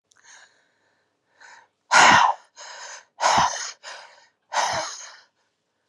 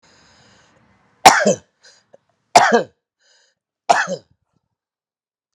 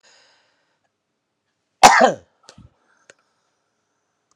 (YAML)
exhalation_length: 5.9 s
exhalation_amplitude: 25294
exhalation_signal_mean_std_ratio: 0.36
three_cough_length: 5.5 s
three_cough_amplitude: 32768
three_cough_signal_mean_std_ratio: 0.27
cough_length: 4.4 s
cough_amplitude: 32768
cough_signal_mean_std_ratio: 0.2
survey_phase: alpha (2021-03-01 to 2021-08-12)
age: 65+
gender: Male
wearing_mask: 'No'
symptom_none: true
smoker_status: Ex-smoker
respiratory_condition_asthma: false
respiratory_condition_other: false
recruitment_source: REACT
submission_delay: 6 days
covid_test_result: Negative
covid_test_method: RT-qPCR